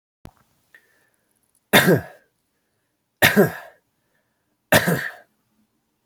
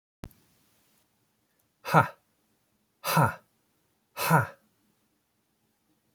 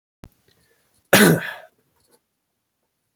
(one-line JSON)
{"three_cough_length": "6.1 s", "three_cough_amplitude": 31813, "three_cough_signal_mean_std_ratio": 0.29, "exhalation_length": "6.1 s", "exhalation_amplitude": 18721, "exhalation_signal_mean_std_ratio": 0.25, "cough_length": "3.2 s", "cough_amplitude": 32181, "cough_signal_mean_std_ratio": 0.25, "survey_phase": "beta (2021-08-13 to 2022-03-07)", "age": "18-44", "gender": "Male", "wearing_mask": "No", "symptom_runny_or_blocked_nose": true, "symptom_fatigue": true, "smoker_status": "Current smoker (1 to 10 cigarettes per day)", "respiratory_condition_asthma": false, "respiratory_condition_other": false, "recruitment_source": "REACT", "submission_delay": "1 day", "covid_test_result": "Positive", "covid_test_method": "RT-qPCR", "covid_ct_value": 17.0, "covid_ct_gene": "E gene", "influenza_a_test_result": "Negative", "influenza_b_test_result": "Negative"}